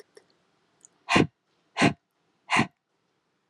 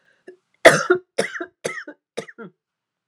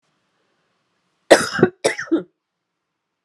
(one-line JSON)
{"exhalation_length": "3.5 s", "exhalation_amplitude": 16531, "exhalation_signal_mean_std_ratio": 0.28, "three_cough_length": "3.1 s", "three_cough_amplitude": 32768, "three_cough_signal_mean_std_ratio": 0.27, "cough_length": "3.2 s", "cough_amplitude": 32768, "cough_signal_mean_std_ratio": 0.27, "survey_phase": "alpha (2021-03-01 to 2021-08-12)", "age": "45-64", "gender": "Female", "wearing_mask": "No", "symptom_none": true, "smoker_status": "Never smoked", "respiratory_condition_asthma": false, "respiratory_condition_other": false, "recruitment_source": "REACT", "submission_delay": "1 day", "covid_test_result": "Negative", "covid_test_method": "RT-qPCR"}